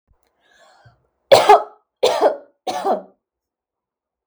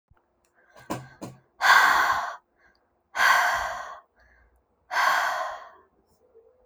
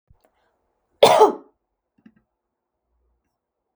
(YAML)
three_cough_length: 4.3 s
three_cough_amplitude: 32768
three_cough_signal_mean_std_ratio: 0.32
exhalation_length: 6.7 s
exhalation_amplitude: 19469
exhalation_signal_mean_std_ratio: 0.45
cough_length: 3.8 s
cough_amplitude: 32768
cough_signal_mean_std_ratio: 0.21
survey_phase: beta (2021-08-13 to 2022-03-07)
age: 18-44
gender: Female
wearing_mask: 'No'
symptom_none: true
smoker_status: Never smoked
respiratory_condition_asthma: false
respiratory_condition_other: false
recruitment_source: REACT
submission_delay: 1 day
covid_test_result: Negative
covid_test_method: RT-qPCR